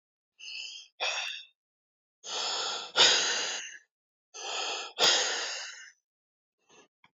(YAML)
exhalation_length: 7.2 s
exhalation_amplitude: 14283
exhalation_signal_mean_std_ratio: 0.47
survey_phase: beta (2021-08-13 to 2022-03-07)
age: 65+
gender: Male
wearing_mask: 'No'
symptom_cough_any: true
smoker_status: Ex-smoker
respiratory_condition_asthma: false
respiratory_condition_other: false
recruitment_source: REACT
submission_delay: 2 days
covid_test_result: Negative
covid_test_method: RT-qPCR